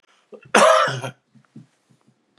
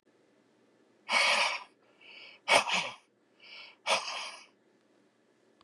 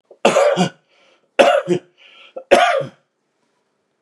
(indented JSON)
{
  "cough_length": "2.4 s",
  "cough_amplitude": 32309,
  "cough_signal_mean_std_ratio": 0.36,
  "exhalation_length": "5.6 s",
  "exhalation_amplitude": 11803,
  "exhalation_signal_mean_std_ratio": 0.38,
  "three_cough_length": "4.0 s",
  "three_cough_amplitude": 32768,
  "three_cough_signal_mean_std_ratio": 0.43,
  "survey_phase": "beta (2021-08-13 to 2022-03-07)",
  "age": "45-64",
  "gender": "Male",
  "wearing_mask": "No",
  "symptom_cough_any": true,
  "symptom_runny_or_blocked_nose": true,
  "symptom_shortness_of_breath": true,
  "symptom_sore_throat": true,
  "smoker_status": "Ex-smoker",
  "respiratory_condition_asthma": false,
  "respiratory_condition_other": false,
  "recruitment_source": "REACT",
  "submission_delay": "1 day",
  "covid_test_result": "Positive",
  "covid_test_method": "RT-qPCR",
  "covid_ct_value": 29.0,
  "covid_ct_gene": "E gene",
  "influenza_a_test_result": "Negative",
  "influenza_b_test_result": "Negative"
}